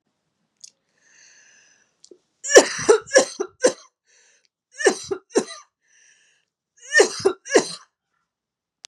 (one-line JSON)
{"three_cough_length": "8.9 s", "three_cough_amplitude": 32768, "three_cough_signal_mean_std_ratio": 0.28, "survey_phase": "beta (2021-08-13 to 2022-03-07)", "age": "18-44", "gender": "Female", "wearing_mask": "No", "symptom_runny_or_blocked_nose": true, "symptom_sore_throat": true, "smoker_status": "Never smoked", "respiratory_condition_asthma": false, "respiratory_condition_other": false, "recruitment_source": "Test and Trace", "submission_delay": "1 day", "covid_test_result": "Negative", "covid_test_method": "ePCR"}